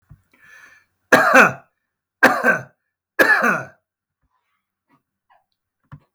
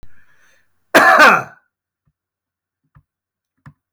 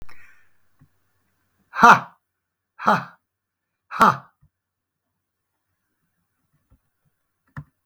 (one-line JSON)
{"three_cough_length": "6.1 s", "three_cough_amplitude": 32768, "three_cough_signal_mean_std_ratio": 0.33, "cough_length": "3.9 s", "cough_amplitude": 32768, "cough_signal_mean_std_ratio": 0.3, "exhalation_length": "7.9 s", "exhalation_amplitude": 32768, "exhalation_signal_mean_std_ratio": 0.21, "survey_phase": "beta (2021-08-13 to 2022-03-07)", "age": "65+", "gender": "Male", "wearing_mask": "No", "symptom_none": true, "smoker_status": "Ex-smoker", "respiratory_condition_asthma": false, "respiratory_condition_other": false, "recruitment_source": "REACT", "submission_delay": "7 days", "covid_test_result": "Negative", "covid_test_method": "RT-qPCR"}